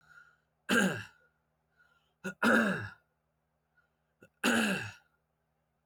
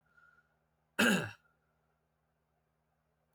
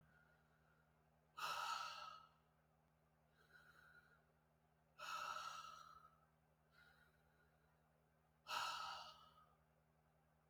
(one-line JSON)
{"three_cough_length": "5.9 s", "three_cough_amplitude": 7306, "three_cough_signal_mean_std_ratio": 0.37, "cough_length": "3.3 s", "cough_amplitude": 5581, "cough_signal_mean_std_ratio": 0.24, "exhalation_length": "10.5 s", "exhalation_amplitude": 871, "exhalation_signal_mean_std_ratio": 0.44, "survey_phase": "beta (2021-08-13 to 2022-03-07)", "age": "18-44", "gender": "Male", "wearing_mask": "No", "symptom_runny_or_blocked_nose": true, "symptom_onset": "5 days", "smoker_status": "Ex-smoker", "respiratory_condition_asthma": false, "respiratory_condition_other": false, "recruitment_source": "Test and Trace", "submission_delay": "2 days", "covid_test_result": "Positive", "covid_test_method": "RT-qPCR", "covid_ct_value": 20.5, "covid_ct_gene": "ORF1ab gene", "covid_ct_mean": 20.5, "covid_viral_load": "190000 copies/ml", "covid_viral_load_category": "Low viral load (10K-1M copies/ml)"}